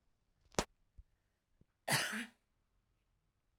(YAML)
cough_length: 3.6 s
cough_amplitude: 9678
cough_signal_mean_std_ratio: 0.26
survey_phase: alpha (2021-03-01 to 2021-08-12)
age: 18-44
gender: Female
wearing_mask: 'No'
symptom_none: true
symptom_onset: 12 days
smoker_status: Ex-smoker
respiratory_condition_asthma: false
respiratory_condition_other: false
recruitment_source: REACT
submission_delay: 1 day
covid_test_result: Negative
covid_test_method: RT-qPCR